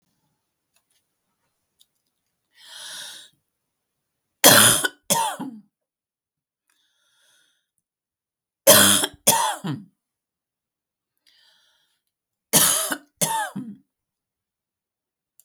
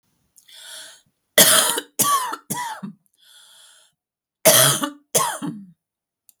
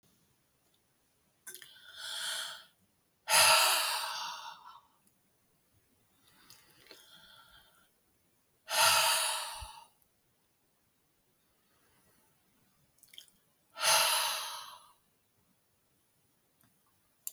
{
  "three_cough_length": "15.4 s",
  "three_cough_amplitude": 32768,
  "three_cough_signal_mean_std_ratio": 0.27,
  "cough_length": "6.4 s",
  "cough_amplitude": 32768,
  "cough_signal_mean_std_ratio": 0.4,
  "exhalation_length": "17.3 s",
  "exhalation_amplitude": 9386,
  "exhalation_signal_mean_std_ratio": 0.33,
  "survey_phase": "beta (2021-08-13 to 2022-03-07)",
  "age": "45-64",
  "gender": "Female",
  "wearing_mask": "No",
  "symptom_cough_any": true,
  "symptom_loss_of_taste": true,
  "symptom_onset": "8 days",
  "smoker_status": "Ex-smoker",
  "respiratory_condition_asthma": false,
  "respiratory_condition_other": false,
  "recruitment_source": "Test and Trace",
  "submission_delay": "1 day",
  "covid_test_result": "Positive",
  "covid_test_method": "RT-qPCR",
  "covid_ct_value": 29.6,
  "covid_ct_gene": "ORF1ab gene"
}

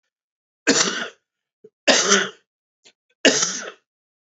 {
  "three_cough_length": "4.3 s",
  "three_cough_amplitude": 31520,
  "three_cough_signal_mean_std_ratio": 0.38,
  "survey_phase": "beta (2021-08-13 to 2022-03-07)",
  "age": "45-64",
  "gender": "Male",
  "wearing_mask": "No",
  "symptom_cough_any": true,
  "smoker_status": "Ex-smoker",
  "respiratory_condition_asthma": false,
  "respiratory_condition_other": false,
  "recruitment_source": "REACT",
  "submission_delay": "1 day",
  "covid_test_result": "Negative",
  "covid_test_method": "RT-qPCR",
  "influenza_a_test_result": "Negative",
  "influenza_b_test_result": "Negative"
}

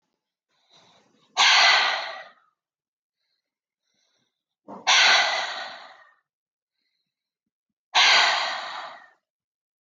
{
  "exhalation_length": "9.8 s",
  "exhalation_amplitude": 18721,
  "exhalation_signal_mean_std_ratio": 0.38,
  "survey_phase": "alpha (2021-03-01 to 2021-08-12)",
  "age": "18-44",
  "gender": "Female",
  "wearing_mask": "No",
  "symptom_none": true,
  "symptom_onset": "12 days",
  "smoker_status": "Never smoked",
  "respiratory_condition_asthma": false,
  "respiratory_condition_other": false,
  "recruitment_source": "REACT",
  "submission_delay": "1 day",
  "covid_test_result": "Negative",
  "covid_test_method": "RT-qPCR"
}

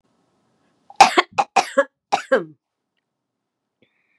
{
  "cough_length": "4.2 s",
  "cough_amplitude": 32768,
  "cough_signal_mean_std_ratio": 0.26,
  "survey_phase": "beta (2021-08-13 to 2022-03-07)",
  "age": "65+",
  "gender": "Female",
  "wearing_mask": "No",
  "symptom_none": true,
  "smoker_status": "Never smoked",
  "respiratory_condition_asthma": false,
  "respiratory_condition_other": false,
  "recruitment_source": "REACT",
  "submission_delay": "2 days",
  "covid_test_result": "Negative",
  "covid_test_method": "RT-qPCR",
  "influenza_a_test_result": "Negative",
  "influenza_b_test_result": "Negative"
}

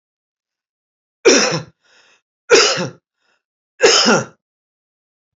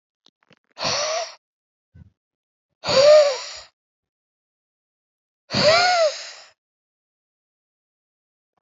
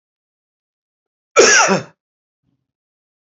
{
  "three_cough_length": "5.4 s",
  "three_cough_amplitude": 32767,
  "three_cough_signal_mean_std_ratio": 0.36,
  "exhalation_length": "8.6 s",
  "exhalation_amplitude": 22633,
  "exhalation_signal_mean_std_ratio": 0.34,
  "cough_length": "3.3 s",
  "cough_amplitude": 32768,
  "cough_signal_mean_std_ratio": 0.29,
  "survey_phase": "alpha (2021-03-01 to 2021-08-12)",
  "age": "45-64",
  "gender": "Male",
  "wearing_mask": "No",
  "symptom_none": true,
  "smoker_status": "Never smoked",
  "respiratory_condition_asthma": false,
  "respiratory_condition_other": false,
  "recruitment_source": "REACT",
  "submission_delay": "1 day",
  "covid_test_result": "Negative",
  "covid_test_method": "RT-qPCR"
}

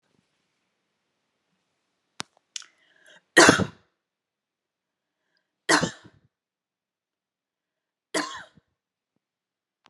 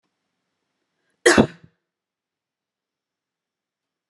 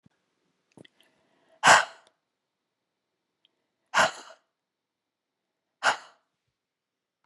{
  "three_cough_length": "9.9 s",
  "three_cough_amplitude": 30882,
  "three_cough_signal_mean_std_ratio": 0.17,
  "cough_length": "4.1 s",
  "cough_amplitude": 32164,
  "cough_signal_mean_std_ratio": 0.17,
  "exhalation_length": "7.3 s",
  "exhalation_amplitude": 21317,
  "exhalation_signal_mean_std_ratio": 0.19,
  "survey_phase": "beta (2021-08-13 to 2022-03-07)",
  "age": "45-64",
  "gender": "Female",
  "wearing_mask": "No",
  "symptom_none": true,
  "smoker_status": "Never smoked",
  "respiratory_condition_asthma": false,
  "respiratory_condition_other": false,
  "recruitment_source": "REACT",
  "submission_delay": "2 days",
  "covid_test_result": "Negative",
  "covid_test_method": "RT-qPCR",
  "influenza_a_test_result": "Unknown/Void",
  "influenza_b_test_result": "Unknown/Void"
}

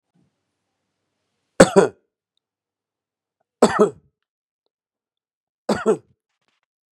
{
  "three_cough_length": "6.9 s",
  "three_cough_amplitude": 32768,
  "three_cough_signal_mean_std_ratio": 0.21,
  "survey_phase": "beta (2021-08-13 to 2022-03-07)",
  "age": "45-64",
  "gender": "Male",
  "wearing_mask": "No",
  "symptom_none": true,
  "symptom_onset": "12 days",
  "smoker_status": "Current smoker (11 or more cigarettes per day)",
  "respiratory_condition_asthma": false,
  "respiratory_condition_other": false,
  "recruitment_source": "REACT",
  "submission_delay": "1 day",
  "covid_test_result": "Negative",
  "covid_test_method": "RT-qPCR",
  "influenza_a_test_result": "Negative",
  "influenza_b_test_result": "Negative"
}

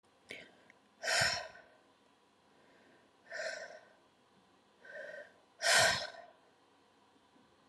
{
  "exhalation_length": "7.7 s",
  "exhalation_amplitude": 5853,
  "exhalation_signal_mean_std_ratio": 0.33,
  "survey_phase": "alpha (2021-03-01 to 2021-08-12)",
  "age": "18-44",
  "gender": "Female",
  "wearing_mask": "No",
  "symptom_none": true,
  "smoker_status": "Ex-smoker",
  "respiratory_condition_asthma": true,
  "respiratory_condition_other": false,
  "recruitment_source": "REACT",
  "submission_delay": "1 day",
  "covid_test_result": "Negative",
  "covid_test_method": "RT-qPCR"
}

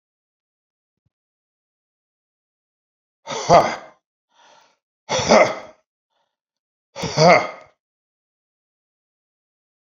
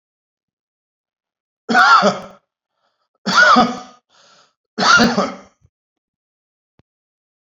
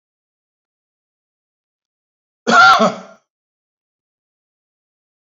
{
  "exhalation_length": "9.9 s",
  "exhalation_amplitude": 28037,
  "exhalation_signal_mean_std_ratio": 0.25,
  "three_cough_length": "7.4 s",
  "three_cough_amplitude": 29432,
  "three_cough_signal_mean_std_ratio": 0.36,
  "cough_length": "5.4 s",
  "cough_amplitude": 28828,
  "cough_signal_mean_std_ratio": 0.23,
  "survey_phase": "beta (2021-08-13 to 2022-03-07)",
  "age": "65+",
  "gender": "Male",
  "wearing_mask": "No",
  "symptom_none": true,
  "smoker_status": "Ex-smoker",
  "respiratory_condition_asthma": false,
  "respiratory_condition_other": false,
  "recruitment_source": "REACT",
  "submission_delay": "2 days",
  "covid_test_result": "Negative",
  "covid_test_method": "RT-qPCR",
  "influenza_a_test_result": "Negative",
  "influenza_b_test_result": "Negative"
}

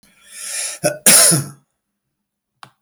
{
  "cough_length": "2.8 s",
  "cough_amplitude": 32766,
  "cough_signal_mean_std_ratio": 0.39,
  "survey_phase": "beta (2021-08-13 to 2022-03-07)",
  "age": "65+",
  "gender": "Male",
  "wearing_mask": "No",
  "symptom_none": true,
  "smoker_status": "Ex-smoker",
  "respiratory_condition_asthma": false,
  "respiratory_condition_other": false,
  "recruitment_source": "REACT",
  "submission_delay": "2 days",
  "covid_test_result": "Negative",
  "covid_test_method": "RT-qPCR"
}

